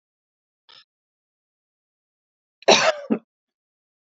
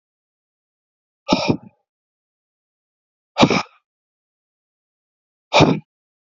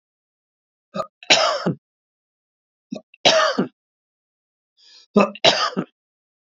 {
  "cough_length": "4.0 s",
  "cough_amplitude": 28960,
  "cough_signal_mean_std_ratio": 0.22,
  "exhalation_length": "6.4 s",
  "exhalation_amplitude": 29078,
  "exhalation_signal_mean_std_ratio": 0.24,
  "three_cough_length": "6.6 s",
  "three_cough_amplitude": 31836,
  "three_cough_signal_mean_std_ratio": 0.34,
  "survey_phase": "beta (2021-08-13 to 2022-03-07)",
  "age": "65+",
  "gender": "Male",
  "wearing_mask": "No",
  "symptom_none": true,
  "smoker_status": "Never smoked",
  "respiratory_condition_asthma": false,
  "respiratory_condition_other": false,
  "recruitment_source": "REACT",
  "submission_delay": "1 day",
  "covid_test_result": "Negative",
  "covid_test_method": "RT-qPCR",
  "influenza_a_test_result": "Negative",
  "influenza_b_test_result": "Negative"
}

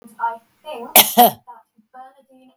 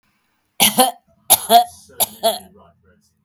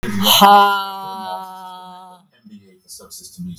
{
  "cough_length": "2.6 s",
  "cough_amplitude": 32768,
  "cough_signal_mean_std_ratio": 0.32,
  "three_cough_length": "3.2 s",
  "three_cough_amplitude": 32768,
  "three_cough_signal_mean_std_ratio": 0.37,
  "exhalation_length": "3.6 s",
  "exhalation_amplitude": 32768,
  "exhalation_signal_mean_std_ratio": 0.47,
  "survey_phase": "beta (2021-08-13 to 2022-03-07)",
  "age": "65+",
  "gender": "Female",
  "wearing_mask": "No",
  "symptom_none": true,
  "smoker_status": "Never smoked",
  "respiratory_condition_asthma": false,
  "respiratory_condition_other": false,
  "recruitment_source": "REACT",
  "submission_delay": "5 days",
  "covid_test_result": "Negative",
  "covid_test_method": "RT-qPCR",
  "influenza_a_test_result": "Negative",
  "influenza_b_test_result": "Negative"
}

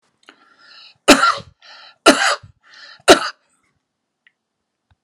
{
  "cough_length": "5.0 s",
  "cough_amplitude": 32768,
  "cough_signal_mean_std_ratio": 0.28,
  "survey_phase": "alpha (2021-03-01 to 2021-08-12)",
  "age": "45-64",
  "gender": "Male",
  "wearing_mask": "No",
  "symptom_none": true,
  "smoker_status": "Never smoked",
  "respiratory_condition_asthma": false,
  "respiratory_condition_other": false,
  "recruitment_source": "REACT",
  "submission_delay": "2 days",
  "covid_test_result": "Negative",
  "covid_test_method": "RT-qPCR"
}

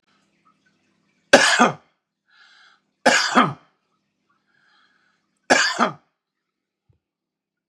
{
  "three_cough_length": "7.7 s",
  "three_cough_amplitude": 32768,
  "three_cough_signal_mean_std_ratio": 0.28,
  "survey_phase": "beta (2021-08-13 to 2022-03-07)",
  "age": "45-64",
  "gender": "Male",
  "wearing_mask": "No",
  "symptom_sore_throat": true,
  "smoker_status": "Ex-smoker",
  "respiratory_condition_asthma": true,
  "respiratory_condition_other": false,
  "recruitment_source": "REACT",
  "submission_delay": "3 days",
  "covid_test_result": "Negative",
  "covid_test_method": "RT-qPCR",
  "influenza_a_test_result": "Negative",
  "influenza_b_test_result": "Negative"
}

